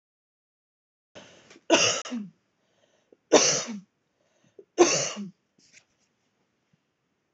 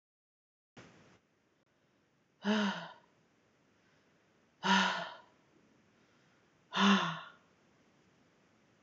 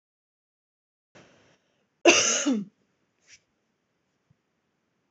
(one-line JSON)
{"three_cough_length": "7.3 s", "three_cough_amplitude": 26464, "three_cough_signal_mean_std_ratio": 0.29, "exhalation_length": "8.8 s", "exhalation_amplitude": 5784, "exhalation_signal_mean_std_ratio": 0.31, "cough_length": "5.1 s", "cough_amplitude": 22704, "cough_signal_mean_std_ratio": 0.25, "survey_phase": "alpha (2021-03-01 to 2021-08-12)", "age": "18-44", "gender": "Female", "wearing_mask": "No", "symptom_headache": true, "smoker_status": "Ex-smoker", "respiratory_condition_asthma": false, "respiratory_condition_other": false, "recruitment_source": "REACT", "submission_delay": "1 day", "covid_test_result": "Negative", "covid_test_method": "RT-qPCR"}